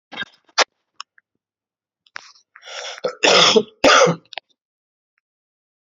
{"cough_length": "5.9 s", "cough_amplitude": 32768, "cough_signal_mean_std_ratio": 0.32, "survey_phase": "beta (2021-08-13 to 2022-03-07)", "age": "18-44", "gender": "Male", "wearing_mask": "No", "symptom_cough_any": true, "symptom_new_continuous_cough": true, "symptom_runny_or_blocked_nose": true, "symptom_shortness_of_breath": true, "symptom_fatigue": true, "symptom_headache": true, "symptom_onset": "2 days", "smoker_status": "Ex-smoker", "respiratory_condition_asthma": false, "respiratory_condition_other": false, "recruitment_source": "Test and Trace", "submission_delay": "1 day", "covid_test_result": "Positive", "covid_test_method": "RT-qPCR", "covid_ct_value": 20.5, "covid_ct_gene": "ORF1ab gene"}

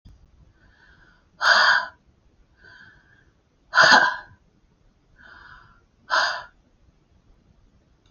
{"exhalation_length": "8.1 s", "exhalation_amplitude": 28797, "exhalation_signal_mean_std_ratio": 0.3, "survey_phase": "beta (2021-08-13 to 2022-03-07)", "age": "65+", "gender": "Female", "wearing_mask": "No", "symptom_none": true, "smoker_status": "Never smoked", "respiratory_condition_asthma": false, "respiratory_condition_other": false, "recruitment_source": "REACT", "submission_delay": "3 days", "covid_test_result": "Negative", "covid_test_method": "RT-qPCR", "influenza_a_test_result": "Negative", "influenza_b_test_result": "Negative"}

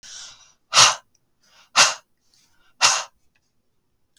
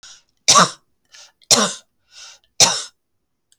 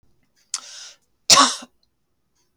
{"exhalation_length": "4.2 s", "exhalation_amplitude": 32768, "exhalation_signal_mean_std_ratio": 0.29, "three_cough_length": "3.6 s", "three_cough_amplitude": 32768, "three_cough_signal_mean_std_ratio": 0.32, "cough_length": "2.6 s", "cough_amplitude": 32768, "cough_signal_mean_std_ratio": 0.25, "survey_phase": "beta (2021-08-13 to 2022-03-07)", "age": "65+", "gender": "Female", "wearing_mask": "No", "symptom_cough_any": true, "smoker_status": "Never smoked", "respiratory_condition_asthma": false, "respiratory_condition_other": false, "recruitment_source": "REACT", "submission_delay": "2 days", "covid_test_result": "Negative", "covid_test_method": "RT-qPCR", "influenza_a_test_result": "Negative", "influenza_b_test_result": "Negative"}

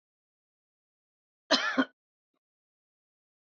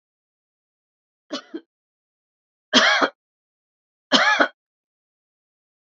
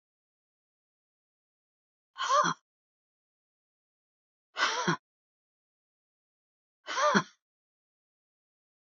{"cough_length": "3.6 s", "cough_amplitude": 10459, "cough_signal_mean_std_ratio": 0.21, "three_cough_length": "5.8 s", "three_cough_amplitude": 31037, "three_cough_signal_mean_std_ratio": 0.28, "exhalation_length": "9.0 s", "exhalation_amplitude": 14499, "exhalation_signal_mean_std_ratio": 0.26, "survey_phase": "alpha (2021-03-01 to 2021-08-12)", "age": "65+", "gender": "Female", "wearing_mask": "No", "symptom_none": true, "smoker_status": "Ex-smoker", "respiratory_condition_asthma": false, "respiratory_condition_other": false, "recruitment_source": "REACT", "submission_delay": "0 days", "covid_test_result": "Negative", "covid_test_method": "RT-qPCR"}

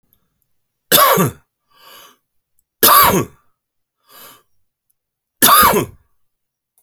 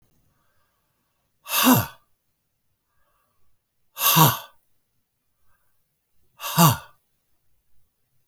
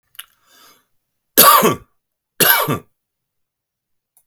{"three_cough_length": "6.8 s", "three_cough_amplitude": 32768, "three_cough_signal_mean_std_ratio": 0.35, "exhalation_length": "8.3 s", "exhalation_amplitude": 31014, "exhalation_signal_mean_std_ratio": 0.27, "cough_length": "4.3 s", "cough_amplitude": 32768, "cough_signal_mean_std_ratio": 0.32, "survey_phase": "alpha (2021-03-01 to 2021-08-12)", "age": "45-64", "gender": "Male", "wearing_mask": "No", "symptom_none": true, "smoker_status": "Current smoker (1 to 10 cigarettes per day)", "respiratory_condition_asthma": false, "respiratory_condition_other": false, "recruitment_source": "REACT", "submission_delay": "1 day", "covid_test_result": "Negative", "covid_test_method": "RT-qPCR"}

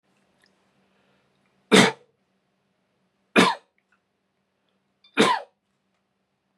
{"three_cough_length": "6.6 s", "three_cough_amplitude": 27306, "three_cough_signal_mean_std_ratio": 0.23, "survey_phase": "beta (2021-08-13 to 2022-03-07)", "age": "18-44", "gender": "Male", "wearing_mask": "No", "symptom_none": true, "smoker_status": "Never smoked", "respiratory_condition_asthma": false, "respiratory_condition_other": false, "recruitment_source": "REACT", "submission_delay": "1 day", "covid_test_result": "Negative", "covid_test_method": "RT-qPCR"}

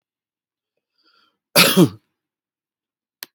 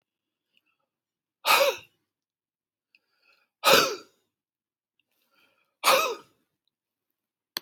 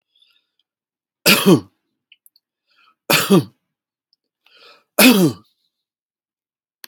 {"cough_length": "3.3 s", "cough_amplitude": 32768, "cough_signal_mean_std_ratio": 0.23, "exhalation_length": "7.6 s", "exhalation_amplitude": 21099, "exhalation_signal_mean_std_ratio": 0.26, "three_cough_length": "6.9 s", "three_cough_amplitude": 32768, "three_cough_signal_mean_std_ratio": 0.29, "survey_phase": "beta (2021-08-13 to 2022-03-07)", "age": "65+", "gender": "Male", "wearing_mask": "No", "symptom_none": true, "smoker_status": "Ex-smoker", "respiratory_condition_asthma": false, "respiratory_condition_other": true, "recruitment_source": "REACT", "submission_delay": "2 days", "covid_test_result": "Negative", "covid_test_method": "RT-qPCR", "influenza_a_test_result": "Negative", "influenza_b_test_result": "Negative"}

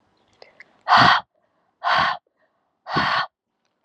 {"exhalation_length": "3.8 s", "exhalation_amplitude": 27792, "exhalation_signal_mean_std_ratio": 0.4, "survey_phase": "beta (2021-08-13 to 2022-03-07)", "age": "18-44", "gender": "Female", "wearing_mask": "No", "symptom_cough_any": true, "symptom_new_continuous_cough": true, "symptom_runny_or_blocked_nose": true, "symptom_sore_throat": true, "symptom_fatigue": true, "symptom_fever_high_temperature": true, "symptom_change_to_sense_of_smell_or_taste": true, "symptom_loss_of_taste": true, "symptom_onset": "3 days", "smoker_status": "Never smoked", "respiratory_condition_asthma": false, "respiratory_condition_other": false, "recruitment_source": "Test and Trace", "submission_delay": "2 days", "covid_test_result": "Positive", "covid_test_method": "RT-qPCR", "covid_ct_value": 19.7, "covid_ct_gene": "N gene", "covid_ct_mean": 20.3, "covid_viral_load": "220000 copies/ml", "covid_viral_load_category": "Low viral load (10K-1M copies/ml)"}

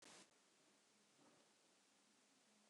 {"exhalation_length": "2.7 s", "exhalation_amplitude": 77, "exhalation_signal_mean_std_ratio": 0.83, "survey_phase": "beta (2021-08-13 to 2022-03-07)", "age": "45-64", "gender": "Female", "wearing_mask": "No", "symptom_none": true, "smoker_status": "Never smoked", "respiratory_condition_asthma": false, "respiratory_condition_other": false, "recruitment_source": "REACT", "submission_delay": "1 day", "covid_test_result": "Negative", "covid_test_method": "RT-qPCR"}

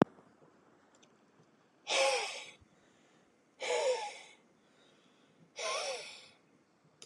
{"exhalation_length": "7.1 s", "exhalation_amplitude": 11112, "exhalation_signal_mean_std_ratio": 0.37, "survey_phase": "beta (2021-08-13 to 2022-03-07)", "age": "45-64", "gender": "Male", "wearing_mask": "No", "symptom_none": true, "smoker_status": "Never smoked", "respiratory_condition_asthma": false, "respiratory_condition_other": false, "recruitment_source": "REACT", "submission_delay": "1 day", "covid_test_result": "Negative", "covid_test_method": "RT-qPCR"}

